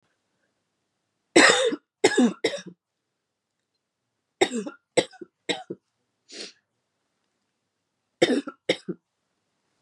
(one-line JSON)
{"three_cough_length": "9.8 s", "three_cough_amplitude": 26240, "three_cough_signal_mean_std_ratio": 0.28, "survey_phase": "beta (2021-08-13 to 2022-03-07)", "age": "18-44", "gender": "Female", "wearing_mask": "No", "symptom_cough_any": true, "symptom_runny_or_blocked_nose": true, "symptom_sore_throat": true, "symptom_diarrhoea": true, "symptom_fatigue": true, "symptom_other": true, "smoker_status": "Ex-smoker", "respiratory_condition_asthma": false, "respiratory_condition_other": false, "recruitment_source": "Test and Trace", "submission_delay": "1 day", "covid_test_result": "Positive", "covid_test_method": "RT-qPCR", "covid_ct_value": 23.3, "covid_ct_gene": "N gene"}